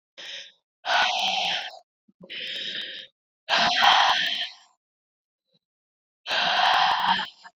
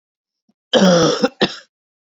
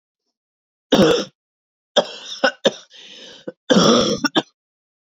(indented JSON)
{
  "exhalation_length": "7.6 s",
  "exhalation_amplitude": 16984,
  "exhalation_signal_mean_std_ratio": 0.56,
  "cough_length": "2.0 s",
  "cough_amplitude": 31447,
  "cough_signal_mean_std_ratio": 0.46,
  "three_cough_length": "5.1 s",
  "three_cough_amplitude": 30029,
  "three_cough_signal_mean_std_ratio": 0.39,
  "survey_phase": "beta (2021-08-13 to 2022-03-07)",
  "age": "18-44",
  "gender": "Female",
  "wearing_mask": "No",
  "symptom_cough_any": true,
  "symptom_runny_or_blocked_nose": true,
  "smoker_status": "Never smoked",
  "respiratory_condition_asthma": false,
  "respiratory_condition_other": false,
  "recruitment_source": "Test and Trace",
  "submission_delay": "2 days",
  "covid_test_result": "Positive",
  "covid_test_method": "RT-qPCR",
  "covid_ct_value": 29.9,
  "covid_ct_gene": "ORF1ab gene",
  "covid_ct_mean": 30.0,
  "covid_viral_load": "150 copies/ml",
  "covid_viral_load_category": "Minimal viral load (< 10K copies/ml)"
}